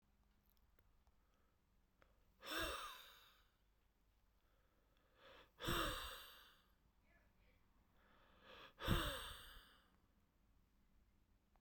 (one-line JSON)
{"exhalation_length": "11.6 s", "exhalation_amplitude": 1862, "exhalation_signal_mean_std_ratio": 0.34, "survey_phase": "beta (2021-08-13 to 2022-03-07)", "age": "18-44", "gender": "Male", "wearing_mask": "No", "symptom_cough_any": true, "symptom_runny_or_blocked_nose": true, "symptom_fatigue": true, "symptom_fever_high_temperature": true, "symptom_change_to_sense_of_smell_or_taste": true, "symptom_loss_of_taste": true, "symptom_onset": "3 days", "smoker_status": "Never smoked", "respiratory_condition_asthma": true, "respiratory_condition_other": false, "recruitment_source": "Test and Trace", "submission_delay": "2 days", "covid_test_result": "Positive", "covid_test_method": "RT-qPCR", "covid_ct_value": 14.8, "covid_ct_gene": "N gene", "covid_ct_mean": 15.9, "covid_viral_load": "6200000 copies/ml", "covid_viral_load_category": "High viral load (>1M copies/ml)"}